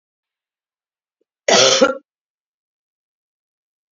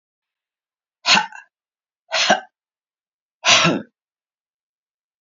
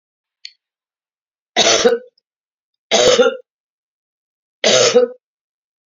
{
  "cough_length": "3.9 s",
  "cough_amplitude": 32768,
  "cough_signal_mean_std_ratio": 0.26,
  "exhalation_length": "5.2 s",
  "exhalation_amplitude": 32141,
  "exhalation_signal_mean_std_ratio": 0.3,
  "three_cough_length": "5.9 s",
  "three_cough_amplitude": 32249,
  "three_cough_signal_mean_std_ratio": 0.38,
  "survey_phase": "beta (2021-08-13 to 2022-03-07)",
  "age": "65+",
  "gender": "Male",
  "wearing_mask": "No",
  "symptom_cough_any": true,
  "symptom_runny_or_blocked_nose": true,
  "symptom_fatigue": true,
  "symptom_headache": true,
  "smoker_status": "Current smoker (11 or more cigarettes per day)",
  "respiratory_condition_asthma": false,
  "respiratory_condition_other": false,
  "recruitment_source": "Test and Trace",
  "submission_delay": "2 days",
  "covid_test_result": "Negative",
  "covid_test_method": "ePCR"
}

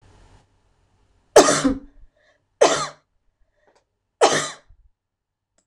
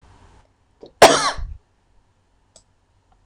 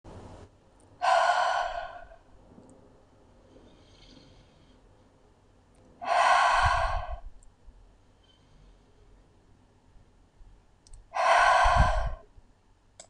{
  "three_cough_length": "5.7 s",
  "three_cough_amplitude": 26028,
  "three_cough_signal_mean_std_ratio": 0.28,
  "cough_length": "3.3 s",
  "cough_amplitude": 26028,
  "cough_signal_mean_std_ratio": 0.24,
  "exhalation_length": "13.1 s",
  "exhalation_amplitude": 11483,
  "exhalation_signal_mean_std_ratio": 0.42,
  "survey_phase": "beta (2021-08-13 to 2022-03-07)",
  "age": "45-64",
  "gender": "Female",
  "wearing_mask": "No",
  "symptom_none": true,
  "smoker_status": "Never smoked",
  "respiratory_condition_asthma": false,
  "respiratory_condition_other": false,
  "recruitment_source": "REACT",
  "submission_delay": "1 day",
  "covid_test_result": "Negative",
  "covid_test_method": "RT-qPCR",
  "influenza_a_test_result": "Negative",
  "influenza_b_test_result": "Negative"
}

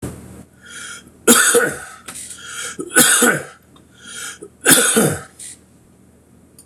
{
  "three_cough_length": "6.7 s",
  "three_cough_amplitude": 26028,
  "three_cough_signal_mean_std_ratio": 0.45,
  "survey_phase": "beta (2021-08-13 to 2022-03-07)",
  "age": "65+",
  "gender": "Male",
  "wearing_mask": "No",
  "symptom_cough_any": true,
  "symptom_runny_or_blocked_nose": true,
  "smoker_status": "Never smoked",
  "respiratory_condition_asthma": false,
  "respiratory_condition_other": false,
  "recruitment_source": "REACT",
  "submission_delay": "1 day",
  "covid_test_result": "Negative",
  "covid_test_method": "RT-qPCR"
}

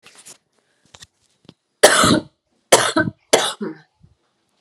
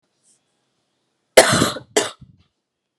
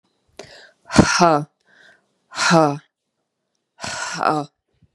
{
  "three_cough_length": "4.6 s",
  "three_cough_amplitude": 32768,
  "three_cough_signal_mean_std_ratio": 0.34,
  "cough_length": "3.0 s",
  "cough_amplitude": 32768,
  "cough_signal_mean_std_ratio": 0.27,
  "exhalation_length": "4.9 s",
  "exhalation_amplitude": 32768,
  "exhalation_signal_mean_std_ratio": 0.36,
  "survey_phase": "beta (2021-08-13 to 2022-03-07)",
  "age": "18-44",
  "gender": "Female",
  "wearing_mask": "No",
  "symptom_cough_any": true,
  "symptom_new_continuous_cough": true,
  "symptom_runny_or_blocked_nose": true,
  "symptom_sore_throat": true,
  "symptom_abdominal_pain": true,
  "symptom_fatigue": true,
  "symptom_headache": true,
  "symptom_onset": "3 days",
  "smoker_status": "Never smoked",
  "respiratory_condition_asthma": false,
  "respiratory_condition_other": false,
  "recruitment_source": "Test and Trace",
  "submission_delay": "1 day",
  "covid_test_result": "Positive",
  "covid_test_method": "RT-qPCR",
  "covid_ct_value": 17.7,
  "covid_ct_gene": "ORF1ab gene"
}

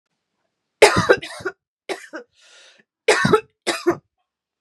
{
  "three_cough_length": "4.6 s",
  "three_cough_amplitude": 32768,
  "three_cough_signal_mean_std_ratio": 0.33,
  "survey_phase": "beta (2021-08-13 to 2022-03-07)",
  "age": "18-44",
  "gender": "Female",
  "wearing_mask": "No",
  "symptom_cough_any": true,
  "symptom_runny_or_blocked_nose": true,
  "symptom_shortness_of_breath": true,
  "symptom_fatigue": true,
  "symptom_headache": true,
  "symptom_onset": "2 days",
  "smoker_status": "Never smoked",
  "respiratory_condition_asthma": false,
  "respiratory_condition_other": false,
  "recruitment_source": "Test and Trace",
  "submission_delay": "1 day",
  "covid_test_result": "Positive",
  "covid_test_method": "RT-qPCR",
  "covid_ct_value": 16.4,
  "covid_ct_gene": "ORF1ab gene",
  "covid_ct_mean": 16.9,
  "covid_viral_load": "2900000 copies/ml",
  "covid_viral_load_category": "High viral load (>1M copies/ml)"
}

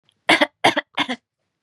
{
  "three_cough_length": "1.6 s",
  "three_cough_amplitude": 31812,
  "three_cough_signal_mean_std_ratio": 0.37,
  "survey_phase": "beta (2021-08-13 to 2022-03-07)",
  "age": "18-44",
  "gender": "Female",
  "wearing_mask": "No",
  "symptom_fatigue": true,
  "symptom_headache": true,
  "smoker_status": "Never smoked",
  "respiratory_condition_asthma": false,
  "respiratory_condition_other": false,
  "recruitment_source": "REACT",
  "submission_delay": "1 day",
  "covid_test_result": "Negative",
  "covid_test_method": "RT-qPCR",
  "influenza_a_test_result": "Negative",
  "influenza_b_test_result": "Negative"
}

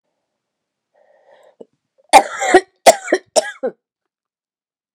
{
  "three_cough_length": "4.9 s",
  "three_cough_amplitude": 32768,
  "three_cough_signal_mean_std_ratio": 0.25,
  "survey_phase": "beta (2021-08-13 to 2022-03-07)",
  "age": "45-64",
  "gender": "Female",
  "wearing_mask": "No",
  "symptom_cough_any": true,
  "symptom_runny_or_blocked_nose": true,
  "symptom_shortness_of_breath": true,
  "symptom_diarrhoea": true,
  "symptom_fatigue": true,
  "symptom_headache": true,
  "symptom_onset": "6 days",
  "smoker_status": "Never smoked",
  "respiratory_condition_asthma": true,
  "respiratory_condition_other": false,
  "recruitment_source": "Test and Trace",
  "submission_delay": "2 days",
  "covid_test_result": "Positive",
  "covid_test_method": "RT-qPCR",
  "covid_ct_value": 25.1,
  "covid_ct_gene": "ORF1ab gene"
}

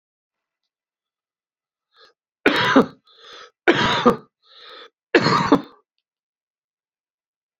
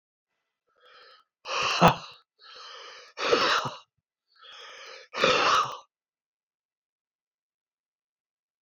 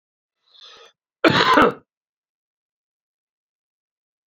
{
  "three_cough_length": "7.6 s",
  "three_cough_amplitude": 32768,
  "three_cough_signal_mean_std_ratio": 0.31,
  "exhalation_length": "8.6 s",
  "exhalation_amplitude": 24726,
  "exhalation_signal_mean_std_ratio": 0.34,
  "cough_length": "4.3 s",
  "cough_amplitude": 28075,
  "cough_signal_mean_std_ratio": 0.26,
  "survey_phase": "alpha (2021-03-01 to 2021-08-12)",
  "age": "45-64",
  "gender": "Male",
  "wearing_mask": "No",
  "symptom_cough_any": true,
  "symptom_diarrhoea": true,
  "symptom_fatigue": true,
  "symptom_onset": "8 days",
  "smoker_status": "Ex-smoker",
  "respiratory_condition_asthma": false,
  "respiratory_condition_other": false,
  "recruitment_source": "Test and Trace",
  "submission_delay": "2 days",
  "covid_test_result": "Positive",
  "covid_test_method": "RT-qPCR",
  "covid_ct_value": 20.3,
  "covid_ct_gene": "N gene",
  "covid_ct_mean": 21.5,
  "covid_viral_load": "89000 copies/ml",
  "covid_viral_load_category": "Low viral load (10K-1M copies/ml)"
}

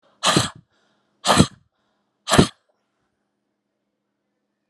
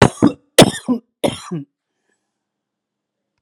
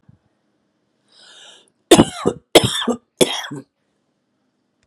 {
  "exhalation_length": "4.7 s",
  "exhalation_amplitude": 32768,
  "exhalation_signal_mean_std_ratio": 0.27,
  "three_cough_length": "3.4 s",
  "three_cough_amplitude": 32768,
  "three_cough_signal_mean_std_ratio": 0.28,
  "cough_length": "4.9 s",
  "cough_amplitude": 32768,
  "cough_signal_mean_std_ratio": 0.27,
  "survey_phase": "alpha (2021-03-01 to 2021-08-12)",
  "age": "45-64",
  "gender": "Female",
  "wearing_mask": "No",
  "symptom_cough_any": true,
  "symptom_shortness_of_breath": true,
  "smoker_status": "Ex-smoker",
  "respiratory_condition_asthma": false,
  "respiratory_condition_other": false,
  "recruitment_source": "REACT",
  "submission_delay": "2 days",
  "covid_test_result": "Negative",
  "covid_test_method": "RT-qPCR"
}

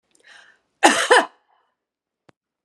{
  "cough_length": "2.6 s",
  "cough_amplitude": 32768,
  "cough_signal_mean_std_ratio": 0.28,
  "survey_phase": "beta (2021-08-13 to 2022-03-07)",
  "age": "45-64",
  "gender": "Male",
  "wearing_mask": "No",
  "symptom_none": true,
  "symptom_onset": "2 days",
  "smoker_status": "Never smoked",
  "respiratory_condition_asthma": false,
  "respiratory_condition_other": false,
  "recruitment_source": "Test and Trace",
  "submission_delay": "1 day",
  "covid_test_result": "Positive",
  "covid_test_method": "ePCR"
}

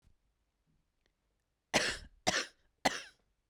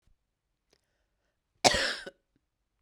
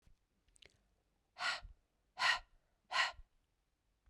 {
  "three_cough_length": "3.5 s",
  "three_cough_amplitude": 7126,
  "three_cough_signal_mean_std_ratio": 0.29,
  "cough_length": "2.8 s",
  "cough_amplitude": 21254,
  "cough_signal_mean_std_ratio": 0.23,
  "exhalation_length": "4.1 s",
  "exhalation_amplitude": 3237,
  "exhalation_signal_mean_std_ratio": 0.31,
  "survey_phase": "beta (2021-08-13 to 2022-03-07)",
  "age": "45-64",
  "gender": "Female",
  "wearing_mask": "No",
  "symptom_cough_any": true,
  "symptom_runny_or_blocked_nose": true,
  "symptom_shortness_of_breath": true,
  "symptom_abdominal_pain": true,
  "symptom_fatigue": true,
  "symptom_fever_high_temperature": true,
  "symptom_change_to_sense_of_smell_or_taste": true,
  "symptom_loss_of_taste": true,
  "symptom_onset": "4 days",
  "smoker_status": "Never smoked",
  "respiratory_condition_asthma": false,
  "respiratory_condition_other": false,
  "recruitment_source": "Test and Trace",
  "submission_delay": "3 days",
  "covid_test_result": "Positive",
  "covid_test_method": "RT-qPCR",
  "covid_ct_value": 18.5,
  "covid_ct_gene": "ORF1ab gene",
  "covid_ct_mean": 18.9,
  "covid_viral_load": "640000 copies/ml",
  "covid_viral_load_category": "Low viral load (10K-1M copies/ml)"
}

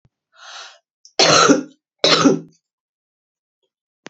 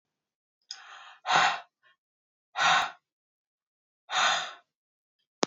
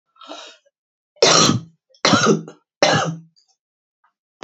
{
  "cough_length": "4.1 s",
  "cough_amplitude": 31660,
  "cough_signal_mean_std_ratio": 0.36,
  "exhalation_length": "5.5 s",
  "exhalation_amplitude": 15994,
  "exhalation_signal_mean_std_ratio": 0.35,
  "three_cough_length": "4.4 s",
  "three_cough_amplitude": 32767,
  "three_cough_signal_mean_std_ratio": 0.4,
  "survey_phase": "beta (2021-08-13 to 2022-03-07)",
  "age": "45-64",
  "gender": "Female",
  "wearing_mask": "No",
  "symptom_runny_or_blocked_nose": true,
  "symptom_sore_throat": true,
  "symptom_fever_high_temperature": true,
  "symptom_headache": true,
  "symptom_onset": "4 days",
  "smoker_status": "Current smoker (1 to 10 cigarettes per day)",
  "respiratory_condition_asthma": false,
  "respiratory_condition_other": false,
  "recruitment_source": "Test and Trace",
  "submission_delay": "2 days",
  "covid_test_result": "Positive",
  "covid_test_method": "RT-qPCR",
  "covid_ct_value": 17.3,
  "covid_ct_gene": "ORF1ab gene",
  "covid_ct_mean": 17.6,
  "covid_viral_load": "1700000 copies/ml",
  "covid_viral_load_category": "High viral load (>1M copies/ml)"
}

